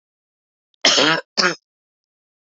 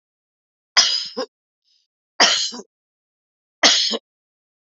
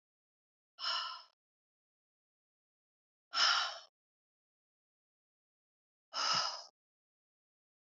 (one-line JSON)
{"cough_length": "2.6 s", "cough_amplitude": 29835, "cough_signal_mean_std_ratio": 0.34, "three_cough_length": "4.7 s", "three_cough_amplitude": 30305, "three_cough_signal_mean_std_ratio": 0.34, "exhalation_length": "7.9 s", "exhalation_amplitude": 4464, "exhalation_signal_mean_std_ratio": 0.29, "survey_phase": "beta (2021-08-13 to 2022-03-07)", "age": "45-64", "gender": "Female", "wearing_mask": "No", "symptom_sore_throat": true, "symptom_abdominal_pain": true, "symptom_fatigue": true, "symptom_onset": "8 days", "smoker_status": "Never smoked", "respiratory_condition_asthma": false, "respiratory_condition_other": false, "recruitment_source": "Test and Trace", "submission_delay": "1 day", "covid_test_result": "Negative", "covid_test_method": "RT-qPCR"}